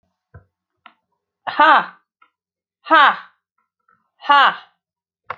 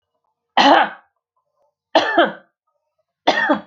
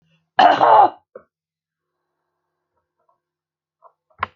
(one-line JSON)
{"exhalation_length": "5.4 s", "exhalation_amplitude": 32214, "exhalation_signal_mean_std_ratio": 0.3, "three_cough_length": "3.7 s", "three_cough_amplitude": 32768, "three_cough_signal_mean_std_ratio": 0.4, "cough_length": "4.4 s", "cough_amplitude": 28857, "cough_signal_mean_std_ratio": 0.28, "survey_phase": "beta (2021-08-13 to 2022-03-07)", "age": "65+", "gender": "Female", "wearing_mask": "No", "symptom_none": true, "smoker_status": "Never smoked", "respiratory_condition_asthma": false, "respiratory_condition_other": false, "recruitment_source": "REACT", "submission_delay": "1 day", "covid_test_result": "Negative", "covid_test_method": "RT-qPCR"}